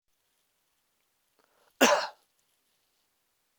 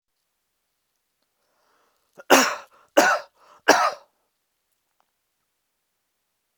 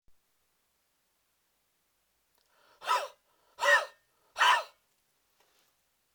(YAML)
cough_length: 3.6 s
cough_amplitude: 15704
cough_signal_mean_std_ratio: 0.2
three_cough_length: 6.6 s
three_cough_amplitude: 32381
three_cough_signal_mean_std_ratio: 0.24
exhalation_length: 6.1 s
exhalation_amplitude: 8591
exhalation_signal_mean_std_ratio: 0.26
survey_phase: beta (2021-08-13 to 2022-03-07)
age: 18-44
gender: Male
wearing_mask: 'No'
symptom_none: true
smoker_status: Never smoked
respiratory_condition_asthma: false
respiratory_condition_other: false
recruitment_source: REACT
submission_delay: 1 day
covid_test_result: Negative
covid_test_method: RT-qPCR